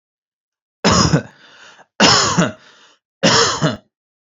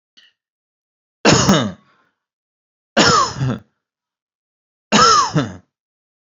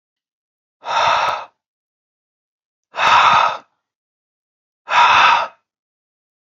{"cough_length": "4.3 s", "cough_amplitude": 30730, "cough_signal_mean_std_ratio": 0.47, "three_cough_length": "6.3 s", "three_cough_amplitude": 31920, "three_cough_signal_mean_std_ratio": 0.39, "exhalation_length": "6.6 s", "exhalation_amplitude": 29875, "exhalation_signal_mean_std_ratio": 0.41, "survey_phase": "beta (2021-08-13 to 2022-03-07)", "age": "18-44", "gender": "Male", "wearing_mask": "No", "symptom_none": true, "smoker_status": "Never smoked", "respiratory_condition_asthma": false, "respiratory_condition_other": false, "recruitment_source": "REACT", "submission_delay": "1 day", "covid_test_result": "Negative", "covid_test_method": "RT-qPCR"}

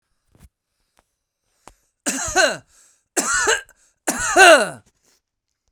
{"three_cough_length": "5.7 s", "three_cough_amplitude": 32768, "three_cough_signal_mean_std_ratio": 0.34, "survey_phase": "beta (2021-08-13 to 2022-03-07)", "age": "18-44", "gender": "Male", "wearing_mask": "No", "symptom_none": true, "smoker_status": "Ex-smoker", "respiratory_condition_asthma": true, "respiratory_condition_other": false, "recruitment_source": "REACT", "submission_delay": "4 days", "covid_test_result": "Negative", "covid_test_method": "RT-qPCR", "influenza_a_test_result": "Negative", "influenza_b_test_result": "Negative"}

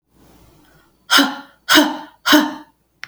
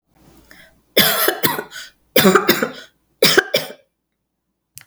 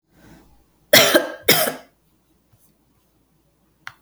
{"exhalation_length": "3.1 s", "exhalation_amplitude": 32768, "exhalation_signal_mean_std_ratio": 0.4, "three_cough_length": "4.9 s", "three_cough_amplitude": 32768, "three_cough_signal_mean_std_ratio": 0.41, "cough_length": "4.0 s", "cough_amplitude": 32768, "cough_signal_mean_std_ratio": 0.29, "survey_phase": "beta (2021-08-13 to 2022-03-07)", "age": "45-64", "gender": "Female", "wearing_mask": "No", "symptom_none": true, "smoker_status": "Never smoked", "respiratory_condition_asthma": false, "respiratory_condition_other": false, "recruitment_source": "REACT", "submission_delay": "7 days", "covid_test_result": "Negative", "covid_test_method": "RT-qPCR", "influenza_a_test_result": "Negative", "influenza_b_test_result": "Negative"}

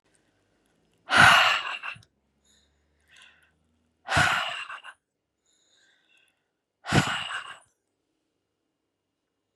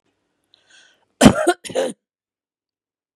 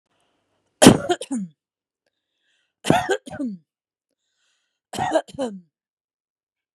{"exhalation_length": "9.6 s", "exhalation_amplitude": 19394, "exhalation_signal_mean_std_ratio": 0.29, "cough_length": "3.2 s", "cough_amplitude": 32768, "cough_signal_mean_std_ratio": 0.25, "three_cough_length": "6.7 s", "three_cough_amplitude": 32768, "three_cough_signal_mean_std_ratio": 0.26, "survey_phase": "beta (2021-08-13 to 2022-03-07)", "age": "45-64", "gender": "Female", "wearing_mask": "No", "symptom_fatigue": true, "symptom_headache": true, "symptom_onset": "12 days", "smoker_status": "Ex-smoker", "respiratory_condition_asthma": false, "respiratory_condition_other": false, "recruitment_source": "REACT", "submission_delay": "2 days", "covid_test_result": "Negative", "covid_test_method": "RT-qPCR", "influenza_a_test_result": "Unknown/Void", "influenza_b_test_result": "Unknown/Void"}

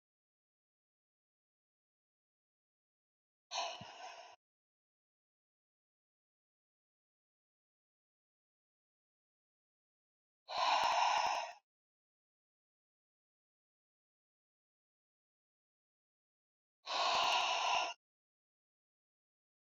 {"exhalation_length": "19.8 s", "exhalation_amplitude": 2895, "exhalation_signal_mean_std_ratio": 0.28, "survey_phase": "beta (2021-08-13 to 2022-03-07)", "age": "45-64", "gender": "Female", "wearing_mask": "No", "symptom_cough_any": true, "symptom_shortness_of_breath": true, "symptom_sore_throat": true, "symptom_fatigue": true, "symptom_onset": "3 days", "smoker_status": "Ex-smoker", "respiratory_condition_asthma": false, "respiratory_condition_other": false, "recruitment_source": "Test and Trace", "submission_delay": "2 days", "covid_test_result": "Positive", "covid_test_method": "ePCR"}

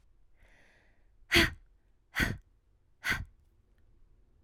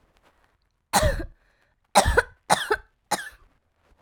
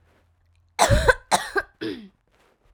{"exhalation_length": "4.4 s", "exhalation_amplitude": 10493, "exhalation_signal_mean_std_ratio": 0.28, "three_cough_length": "4.0 s", "three_cough_amplitude": 23347, "three_cough_signal_mean_std_ratio": 0.35, "cough_length": "2.7 s", "cough_amplitude": 26614, "cough_signal_mean_std_ratio": 0.37, "survey_phase": "alpha (2021-03-01 to 2021-08-12)", "age": "18-44", "gender": "Female", "wearing_mask": "No", "symptom_cough_any": true, "symptom_new_continuous_cough": true, "symptom_shortness_of_breath": true, "symptom_diarrhoea": true, "symptom_fatigue": true, "symptom_headache": true, "symptom_change_to_sense_of_smell_or_taste": true, "symptom_loss_of_taste": true, "symptom_onset": "4 days", "smoker_status": "Never smoked", "respiratory_condition_asthma": false, "respiratory_condition_other": false, "recruitment_source": "Test and Trace", "submission_delay": "2 days", "covid_test_result": "Positive", "covid_test_method": "RT-qPCR", "covid_ct_value": 19.3, "covid_ct_gene": "ORF1ab gene", "covid_ct_mean": 20.3, "covid_viral_load": "220000 copies/ml", "covid_viral_load_category": "Low viral load (10K-1M copies/ml)"}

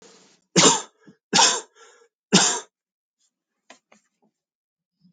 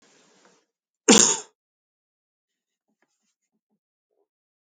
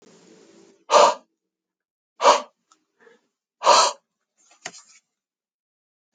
{"three_cough_length": "5.1 s", "three_cough_amplitude": 27127, "three_cough_signal_mean_std_ratio": 0.3, "cough_length": "4.8 s", "cough_amplitude": 26657, "cough_signal_mean_std_ratio": 0.18, "exhalation_length": "6.1 s", "exhalation_amplitude": 26252, "exhalation_signal_mean_std_ratio": 0.27, "survey_phase": "alpha (2021-03-01 to 2021-08-12)", "age": "45-64", "gender": "Male", "wearing_mask": "No", "symptom_none": true, "smoker_status": "Ex-smoker", "respiratory_condition_asthma": false, "respiratory_condition_other": false, "recruitment_source": "REACT", "submission_delay": "1 day", "covid_test_result": "Negative", "covid_test_method": "RT-qPCR"}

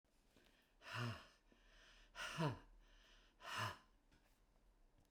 {"exhalation_length": "5.1 s", "exhalation_amplitude": 1053, "exhalation_signal_mean_std_ratio": 0.43, "survey_phase": "beta (2021-08-13 to 2022-03-07)", "age": "65+", "gender": "Male", "wearing_mask": "No", "symptom_none": true, "smoker_status": "Never smoked", "respiratory_condition_asthma": false, "respiratory_condition_other": false, "recruitment_source": "REACT", "submission_delay": "1 day", "covid_test_result": "Negative", "covid_test_method": "RT-qPCR"}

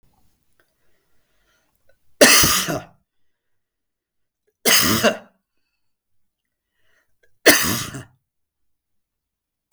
{"three_cough_length": "9.7 s", "three_cough_amplitude": 32768, "three_cough_signal_mean_std_ratio": 0.29, "survey_phase": "beta (2021-08-13 to 2022-03-07)", "age": "45-64", "gender": "Male", "wearing_mask": "No", "symptom_none": true, "smoker_status": "Ex-smoker", "respiratory_condition_asthma": false, "respiratory_condition_other": false, "recruitment_source": "REACT", "submission_delay": "2 days", "covid_test_result": "Negative", "covid_test_method": "RT-qPCR"}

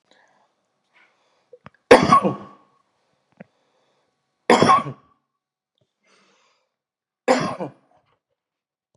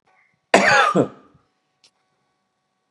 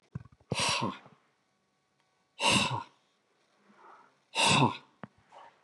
{"three_cough_length": "9.0 s", "three_cough_amplitude": 32768, "three_cough_signal_mean_std_ratio": 0.24, "cough_length": "2.9 s", "cough_amplitude": 32767, "cough_signal_mean_std_ratio": 0.34, "exhalation_length": "5.6 s", "exhalation_amplitude": 7561, "exhalation_signal_mean_std_ratio": 0.38, "survey_phase": "beta (2021-08-13 to 2022-03-07)", "age": "45-64", "gender": "Male", "wearing_mask": "No", "symptom_none": true, "smoker_status": "Ex-smoker", "respiratory_condition_asthma": false, "respiratory_condition_other": false, "recruitment_source": "Test and Trace", "submission_delay": "3 days", "covid_test_result": "Negative", "covid_test_method": "RT-qPCR"}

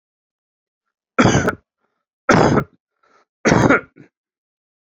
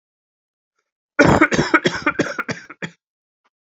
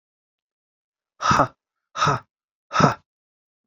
{"three_cough_length": "4.9 s", "three_cough_amplitude": 32768, "three_cough_signal_mean_std_ratio": 0.36, "cough_length": "3.8 s", "cough_amplitude": 28796, "cough_signal_mean_std_ratio": 0.37, "exhalation_length": "3.7 s", "exhalation_amplitude": 25857, "exhalation_signal_mean_std_ratio": 0.32, "survey_phase": "alpha (2021-03-01 to 2021-08-12)", "age": "18-44", "gender": "Male", "wearing_mask": "No", "symptom_cough_any": true, "symptom_new_continuous_cough": true, "symptom_abdominal_pain": true, "symptom_fatigue": true, "symptom_headache": true, "symptom_onset": "3 days", "smoker_status": "Never smoked", "respiratory_condition_asthma": false, "respiratory_condition_other": false, "recruitment_source": "Test and Trace", "submission_delay": "1 day", "covid_test_result": "Positive", "covid_test_method": "RT-qPCR", "covid_ct_value": 20.5, "covid_ct_gene": "ORF1ab gene"}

